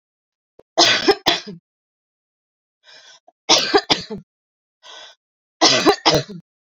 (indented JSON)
{
  "three_cough_length": "6.7 s",
  "three_cough_amplitude": 32768,
  "three_cough_signal_mean_std_ratio": 0.36,
  "survey_phase": "beta (2021-08-13 to 2022-03-07)",
  "age": "18-44",
  "gender": "Female",
  "wearing_mask": "No",
  "symptom_none": true,
  "smoker_status": "Current smoker (1 to 10 cigarettes per day)",
  "respiratory_condition_asthma": false,
  "respiratory_condition_other": false,
  "recruitment_source": "REACT",
  "submission_delay": "3 days",
  "covid_test_result": "Negative",
  "covid_test_method": "RT-qPCR"
}